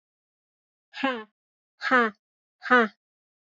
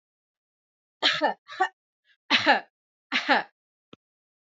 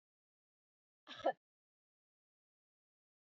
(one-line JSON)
{"exhalation_length": "3.4 s", "exhalation_amplitude": 15957, "exhalation_signal_mean_std_ratio": 0.31, "three_cough_length": "4.4 s", "three_cough_amplitude": 20441, "three_cough_signal_mean_std_ratio": 0.34, "cough_length": "3.2 s", "cough_amplitude": 2065, "cough_signal_mean_std_ratio": 0.14, "survey_phase": "beta (2021-08-13 to 2022-03-07)", "age": "45-64", "gender": "Female", "wearing_mask": "No", "symptom_cough_any": true, "symptom_runny_or_blocked_nose": true, "smoker_status": "Current smoker (e-cigarettes or vapes only)", "respiratory_condition_asthma": false, "respiratory_condition_other": false, "recruitment_source": "Test and Trace", "submission_delay": "2 days", "covid_test_result": "Positive", "covid_test_method": "RT-qPCR"}